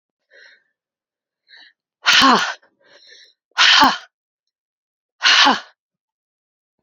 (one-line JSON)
{"exhalation_length": "6.8 s", "exhalation_amplitude": 31901, "exhalation_signal_mean_std_ratio": 0.34, "survey_phase": "alpha (2021-03-01 to 2021-08-12)", "age": "45-64", "gender": "Female", "wearing_mask": "No", "symptom_cough_any": true, "symptom_shortness_of_breath": true, "symptom_abdominal_pain": true, "symptom_fatigue": true, "symptom_fever_high_temperature": true, "symptom_headache": true, "symptom_change_to_sense_of_smell_or_taste": true, "symptom_loss_of_taste": true, "symptom_onset": "5 days", "smoker_status": "Ex-smoker", "respiratory_condition_asthma": false, "respiratory_condition_other": false, "recruitment_source": "Test and Trace", "submission_delay": "2 days", "covid_test_result": "Positive", "covid_test_method": "RT-qPCR", "covid_ct_value": 13.3, "covid_ct_gene": "ORF1ab gene", "covid_ct_mean": 13.9, "covid_viral_load": "28000000 copies/ml", "covid_viral_load_category": "High viral load (>1M copies/ml)"}